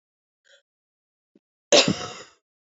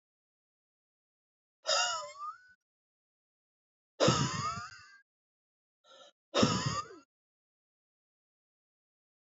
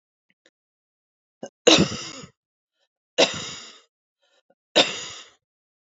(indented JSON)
{
  "cough_length": "2.7 s",
  "cough_amplitude": 25271,
  "cough_signal_mean_std_ratio": 0.23,
  "exhalation_length": "9.4 s",
  "exhalation_amplitude": 7316,
  "exhalation_signal_mean_std_ratio": 0.31,
  "three_cough_length": "5.9 s",
  "three_cough_amplitude": 27850,
  "three_cough_signal_mean_std_ratio": 0.26,
  "survey_phase": "beta (2021-08-13 to 2022-03-07)",
  "age": "18-44",
  "gender": "Female",
  "wearing_mask": "No",
  "symptom_shortness_of_breath": true,
  "symptom_sore_throat": true,
  "symptom_diarrhoea": true,
  "symptom_fatigue": true,
  "symptom_headache": true,
  "smoker_status": "Ex-smoker",
  "respiratory_condition_asthma": false,
  "respiratory_condition_other": false,
  "recruitment_source": "Test and Trace",
  "submission_delay": "2 days",
  "covid_test_result": "Positive",
  "covid_test_method": "RT-qPCR",
  "covid_ct_value": 32.7,
  "covid_ct_gene": "N gene"
}